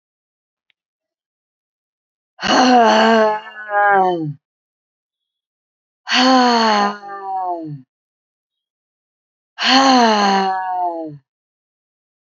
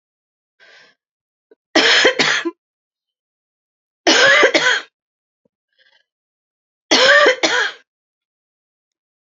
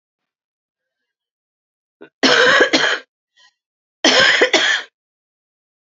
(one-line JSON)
{"exhalation_length": "12.2 s", "exhalation_amplitude": 31742, "exhalation_signal_mean_std_ratio": 0.49, "three_cough_length": "9.4 s", "three_cough_amplitude": 32767, "three_cough_signal_mean_std_ratio": 0.38, "cough_length": "5.9 s", "cough_amplitude": 32298, "cough_signal_mean_std_ratio": 0.41, "survey_phase": "alpha (2021-03-01 to 2021-08-12)", "age": "45-64", "gender": "Female", "wearing_mask": "No", "symptom_cough_any": true, "symptom_shortness_of_breath": true, "symptom_fatigue": true, "smoker_status": "Current smoker (11 or more cigarettes per day)", "respiratory_condition_asthma": true, "respiratory_condition_other": true, "recruitment_source": "REACT", "submission_delay": "2 days", "covid_test_result": "Negative", "covid_test_method": "RT-qPCR"}